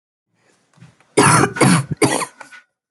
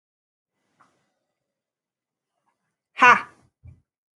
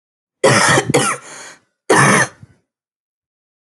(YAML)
three_cough_length: 2.9 s
three_cough_amplitude: 31966
three_cough_signal_mean_std_ratio: 0.45
exhalation_length: 4.2 s
exhalation_amplitude: 28558
exhalation_signal_mean_std_ratio: 0.17
cough_length: 3.7 s
cough_amplitude: 31801
cough_signal_mean_std_ratio: 0.46
survey_phase: alpha (2021-03-01 to 2021-08-12)
age: 18-44
gender: Female
wearing_mask: 'No'
symptom_none: true
smoker_status: Never smoked
respiratory_condition_asthma: false
respiratory_condition_other: false
recruitment_source: REACT
submission_delay: 2 days
covid_test_result: Negative
covid_test_method: RT-qPCR